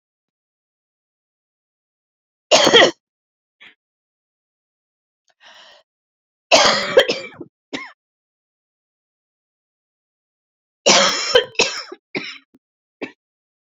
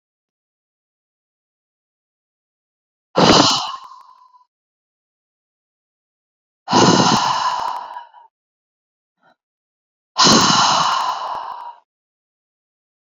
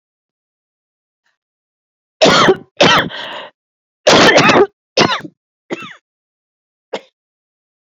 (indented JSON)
{
  "three_cough_length": "13.7 s",
  "three_cough_amplitude": 32768,
  "three_cough_signal_mean_std_ratio": 0.27,
  "exhalation_length": "13.1 s",
  "exhalation_amplitude": 32767,
  "exhalation_signal_mean_std_ratio": 0.37,
  "cough_length": "7.9 s",
  "cough_amplitude": 31719,
  "cough_signal_mean_std_ratio": 0.38,
  "survey_phase": "beta (2021-08-13 to 2022-03-07)",
  "age": "45-64",
  "gender": "Female",
  "wearing_mask": "No",
  "symptom_cough_any": true,
  "symptom_new_continuous_cough": true,
  "symptom_runny_or_blocked_nose": true,
  "symptom_sore_throat": true,
  "symptom_fatigue": true,
  "symptom_fever_high_temperature": true,
  "symptom_headache": true,
  "symptom_change_to_sense_of_smell_or_taste": true,
  "symptom_loss_of_taste": true,
  "symptom_other": true,
  "symptom_onset": "7 days",
  "smoker_status": "Ex-smoker",
  "respiratory_condition_asthma": false,
  "respiratory_condition_other": false,
  "recruitment_source": "Test and Trace",
  "submission_delay": "2 days",
  "covid_test_result": "Positive",
  "covid_test_method": "RT-qPCR",
  "covid_ct_value": 24.4,
  "covid_ct_gene": "ORF1ab gene",
  "covid_ct_mean": 24.9,
  "covid_viral_load": "6800 copies/ml",
  "covid_viral_load_category": "Minimal viral load (< 10K copies/ml)"
}